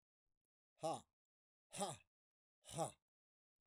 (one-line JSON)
{"exhalation_length": "3.7 s", "exhalation_amplitude": 1052, "exhalation_signal_mean_std_ratio": 0.3, "survey_phase": "beta (2021-08-13 to 2022-03-07)", "age": "45-64", "gender": "Male", "wearing_mask": "Yes", "symptom_cough_any": true, "symptom_runny_or_blocked_nose": true, "symptom_sore_throat": true, "symptom_headache": true, "symptom_change_to_sense_of_smell_or_taste": true, "symptom_onset": "5 days", "smoker_status": "Never smoked", "respiratory_condition_asthma": false, "respiratory_condition_other": false, "recruitment_source": "Test and Trace", "submission_delay": "2 days", "covid_test_result": "Positive", "covid_test_method": "RT-qPCR"}